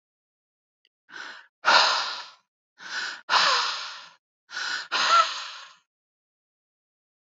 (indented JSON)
{
  "exhalation_length": "7.3 s",
  "exhalation_amplitude": 18665,
  "exhalation_signal_mean_std_ratio": 0.41,
  "survey_phase": "alpha (2021-03-01 to 2021-08-12)",
  "age": "45-64",
  "gender": "Female",
  "wearing_mask": "No",
  "symptom_cough_any": true,
  "symptom_shortness_of_breath": true,
  "symptom_fatigue": true,
  "symptom_onset": "4 days",
  "smoker_status": "Never smoked",
  "respiratory_condition_asthma": false,
  "respiratory_condition_other": false,
  "recruitment_source": "Test and Trace",
  "submission_delay": "2 days",
  "covid_test_result": "Positive",
  "covid_test_method": "RT-qPCR",
  "covid_ct_value": 30.3,
  "covid_ct_gene": "N gene",
  "covid_ct_mean": 30.9,
  "covid_viral_load": "72 copies/ml",
  "covid_viral_load_category": "Minimal viral load (< 10K copies/ml)"
}